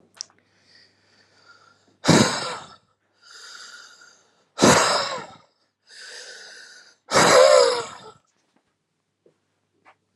{
  "exhalation_length": "10.2 s",
  "exhalation_amplitude": 31292,
  "exhalation_signal_mean_std_ratio": 0.34,
  "survey_phase": "alpha (2021-03-01 to 2021-08-12)",
  "age": "18-44",
  "gender": "Male",
  "wearing_mask": "No",
  "symptom_cough_any": true,
  "symptom_onset": "1 day",
  "smoker_status": "Ex-smoker",
  "respiratory_condition_asthma": false,
  "respiratory_condition_other": false,
  "recruitment_source": "Test and Trace",
  "submission_delay": "0 days",
  "covid_test_result": "Negative",
  "covid_test_method": "RT-qPCR"
}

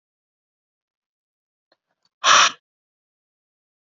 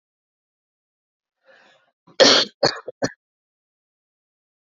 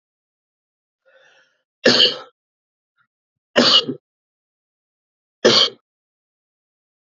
{
  "exhalation_length": "3.8 s",
  "exhalation_amplitude": 27450,
  "exhalation_signal_mean_std_ratio": 0.2,
  "cough_length": "4.7 s",
  "cough_amplitude": 29966,
  "cough_signal_mean_std_ratio": 0.22,
  "three_cough_length": "7.1 s",
  "three_cough_amplitude": 30880,
  "three_cough_signal_mean_std_ratio": 0.27,
  "survey_phase": "beta (2021-08-13 to 2022-03-07)",
  "age": "18-44",
  "gender": "Male",
  "wearing_mask": "No",
  "symptom_cough_any": true,
  "symptom_new_continuous_cough": true,
  "symptom_fatigue": true,
  "smoker_status": "Never smoked",
  "respiratory_condition_asthma": false,
  "respiratory_condition_other": false,
  "recruitment_source": "Test and Trace",
  "submission_delay": "1 day",
  "covid_test_result": "Positive",
  "covid_test_method": "ePCR"
}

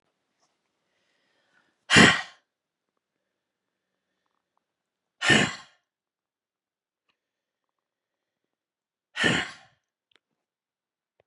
{
  "exhalation_length": "11.3 s",
  "exhalation_amplitude": 24266,
  "exhalation_signal_mean_std_ratio": 0.2,
  "survey_phase": "beta (2021-08-13 to 2022-03-07)",
  "age": "45-64",
  "gender": "Female",
  "wearing_mask": "No",
  "symptom_none": true,
  "smoker_status": "Ex-smoker",
  "respiratory_condition_asthma": false,
  "respiratory_condition_other": false,
  "recruitment_source": "REACT",
  "submission_delay": "2 days",
  "covid_test_result": "Negative",
  "covid_test_method": "RT-qPCR",
  "influenza_a_test_result": "Negative",
  "influenza_b_test_result": "Negative"
}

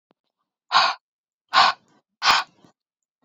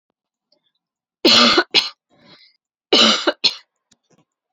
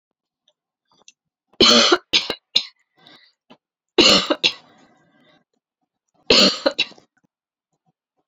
{
  "exhalation_length": "3.2 s",
  "exhalation_amplitude": 23468,
  "exhalation_signal_mean_std_ratio": 0.34,
  "cough_length": "4.5 s",
  "cough_amplitude": 32768,
  "cough_signal_mean_std_ratio": 0.36,
  "three_cough_length": "8.3 s",
  "three_cough_amplitude": 32661,
  "three_cough_signal_mean_std_ratio": 0.31,
  "survey_phase": "alpha (2021-03-01 to 2021-08-12)",
  "age": "18-44",
  "gender": "Female",
  "wearing_mask": "No",
  "symptom_cough_any": true,
  "symptom_new_continuous_cough": true,
  "symptom_fatigue": true,
  "symptom_onset": "3 days",
  "smoker_status": "Never smoked",
  "respiratory_condition_asthma": false,
  "respiratory_condition_other": false,
  "recruitment_source": "Test and Trace",
  "submission_delay": "2 days",
  "covid_test_result": "Positive",
  "covid_test_method": "RT-qPCR",
  "covid_ct_value": 28.7,
  "covid_ct_gene": "ORF1ab gene",
  "covid_ct_mean": 28.9,
  "covid_viral_load": "340 copies/ml",
  "covid_viral_load_category": "Minimal viral load (< 10K copies/ml)"
}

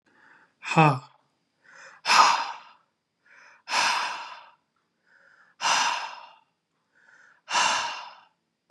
{
  "exhalation_length": "8.7 s",
  "exhalation_amplitude": 21517,
  "exhalation_signal_mean_std_ratio": 0.39,
  "survey_phase": "beta (2021-08-13 to 2022-03-07)",
  "age": "18-44",
  "gender": "Male",
  "wearing_mask": "No",
  "symptom_cough_any": true,
  "symptom_runny_or_blocked_nose": true,
  "symptom_change_to_sense_of_smell_or_taste": true,
  "symptom_onset": "5 days",
  "smoker_status": "Never smoked",
  "respiratory_condition_asthma": false,
  "respiratory_condition_other": false,
  "recruitment_source": "Test and Trace",
  "submission_delay": "2 days",
  "covid_test_result": "Positive",
  "covid_test_method": "RT-qPCR",
  "covid_ct_value": 23.6,
  "covid_ct_gene": "ORF1ab gene",
  "covid_ct_mean": 23.9,
  "covid_viral_load": "14000 copies/ml",
  "covid_viral_load_category": "Low viral load (10K-1M copies/ml)"
}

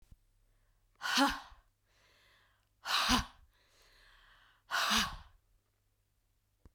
{
  "exhalation_length": "6.7 s",
  "exhalation_amplitude": 6035,
  "exhalation_signal_mean_std_ratio": 0.34,
  "survey_phase": "beta (2021-08-13 to 2022-03-07)",
  "age": "18-44",
  "gender": "Female",
  "wearing_mask": "No",
  "symptom_cough_any": true,
  "symptom_runny_or_blocked_nose": true,
  "symptom_fatigue": true,
  "symptom_fever_high_temperature": true,
  "symptom_headache": true,
  "symptom_change_to_sense_of_smell_or_taste": true,
  "symptom_loss_of_taste": true,
  "symptom_onset": "2 days",
  "smoker_status": "Never smoked",
  "respiratory_condition_asthma": true,
  "respiratory_condition_other": false,
  "recruitment_source": "Test and Trace",
  "submission_delay": "1 day",
  "covid_test_result": "Positive",
  "covid_test_method": "RT-qPCR",
  "covid_ct_value": 18.5,
  "covid_ct_gene": "ORF1ab gene"
}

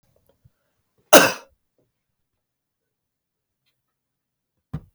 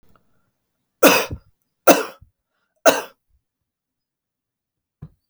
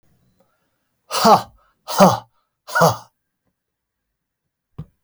{
  "cough_length": "4.9 s",
  "cough_amplitude": 32768,
  "cough_signal_mean_std_ratio": 0.15,
  "three_cough_length": "5.3 s",
  "three_cough_amplitude": 32768,
  "three_cough_signal_mean_std_ratio": 0.23,
  "exhalation_length": "5.0 s",
  "exhalation_amplitude": 32767,
  "exhalation_signal_mean_std_ratio": 0.29,
  "survey_phase": "beta (2021-08-13 to 2022-03-07)",
  "age": "45-64",
  "gender": "Male",
  "wearing_mask": "No",
  "symptom_none": true,
  "smoker_status": "Never smoked",
  "respiratory_condition_asthma": false,
  "respiratory_condition_other": false,
  "recruitment_source": "REACT",
  "submission_delay": "1 day",
  "covid_test_result": "Negative",
  "covid_test_method": "RT-qPCR"
}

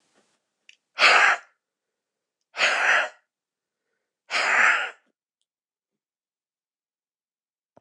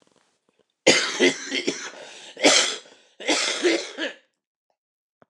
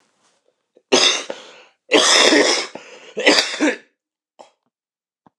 {
  "exhalation_length": "7.8 s",
  "exhalation_amplitude": 23257,
  "exhalation_signal_mean_std_ratio": 0.34,
  "cough_length": "5.3 s",
  "cough_amplitude": 28586,
  "cough_signal_mean_std_ratio": 0.45,
  "three_cough_length": "5.4 s",
  "three_cough_amplitude": 29204,
  "three_cough_signal_mean_std_ratio": 0.44,
  "survey_phase": "beta (2021-08-13 to 2022-03-07)",
  "age": "45-64",
  "gender": "Male",
  "wearing_mask": "No",
  "symptom_cough_any": true,
  "symptom_runny_or_blocked_nose": true,
  "symptom_shortness_of_breath": true,
  "symptom_sore_throat": true,
  "symptom_headache": true,
  "symptom_onset": "7 days",
  "smoker_status": "Never smoked",
  "respiratory_condition_asthma": true,
  "respiratory_condition_other": false,
  "recruitment_source": "Test and Trace",
  "submission_delay": "1 day",
  "covid_test_result": "Negative",
  "covid_test_method": "RT-qPCR"
}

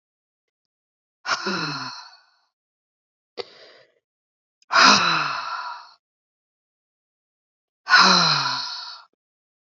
{
  "exhalation_length": "9.6 s",
  "exhalation_amplitude": 28453,
  "exhalation_signal_mean_std_ratio": 0.35,
  "survey_phase": "beta (2021-08-13 to 2022-03-07)",
  "age": "45-64",
  "gender": "Female",
  "wearing_mask": "No",
  "symptom_new_continuous_cough": true,
  "symptom_runny_or_blocked_nose": true,
  "symptom_shortness_of_breath": true,
  "symptom_sore_throat": true,
  "symptom_abdominal_pain": true,
  "symptom_fatigue": true,
  "symptom_fever_high_temperature": true,
  "symptom_headache": true,
  "symptom_onset": "2 days",
  "smoker_status": "Never smoked",
  "respiratory_condition_asthma": false,
  "respiratory_condition_other": false,
  "recruitment_source": "Test and Trace",
  "submission_delay": "2 days",
  "covid_test_result": "Positive",
  "covid_test_method": "RT-qPCR",
  "covid_ct_value": 27.8,
  "covid_ct_gene": "ORF1ab gene",
  "covid_ct_mean": 28.0,
  "covid_viral_load": "630 copies/ml",
  "covid_viral_load_category": "Minimal viral load (< 10K copies/ml)"
}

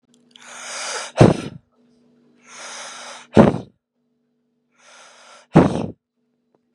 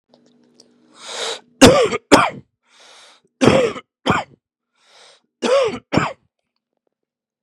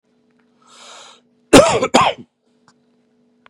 {
  "exhalation_length": "6.7 s",
  "exhalation_amplitude": 32768,
  "exhalation_signal_mean_std_ratio": 0.27,
  "three_cough_length": "7.4 s",
  "three_cough_amplitude": 32768,
  "three_cough_signal_mean_std_ratio": 0.35,
  "cough_length": "3.5 s",
  "cough_amplitude": 32768,
  "cough_signal_mean_std_ratio": 0.29,
  "survey_phase": "beta (2021-08-13 to 2022-03-07)",
  "age": "18-44",
  "gender": "Male",
  "wearing_mask": "No",
  "symptom_none": true,
  "smoker_status": "Current smoker (1 to 10 cigarettes per day)",
  "respiratory_condition_asthma": false,
  "respiratory_condition_other": false,
  "recruitment_source": "REACT",
  "submission_delay": "1 day",
  "covid_test_result": "Negative",
  "covid_test_method": "RT-qPCR",
  "influenza_a_test_result": "Negative",
  "influenza_b_test_result": "Negative"
}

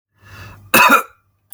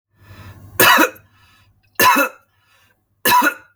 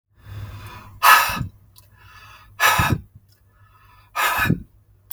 {
  "cough_length": "1.5 s",
  "cough_amplitude": 32768,
  "cough_signal_mean_std_ratio": 0.38,
  "three_cough_length": "3.8 s",
  "three_cough_amplitude": 32768,
  "three_cough_signal_mean_std_ratio": 0.42,
  "exhalation_length": "5.1 s",
  "exhalation_amplitude": 32766,
  "exhalation_signal_mean_std_ratio": 0.4,
  "survey_phase": "beta (2021-08-13 to 2022-03-07)",
  "age": "45-64",
  "gender": "Male",
  "wearing_mask": "No",
  "symptom_none": true,
  "smoker_status": "Ex-smoker",
  "respiratory_condition_asthma": false,
  "respiratory_condition_other": false,
  "recruitment_source": "REACT",
  "submission_delay": "6 days",
  "covid_test_result": "Negative",
  "covid_test_method": "RT-qPCR",
  "influenza_a_test_result": "Negative",
  "influenza_b_test_result": "Negative"
}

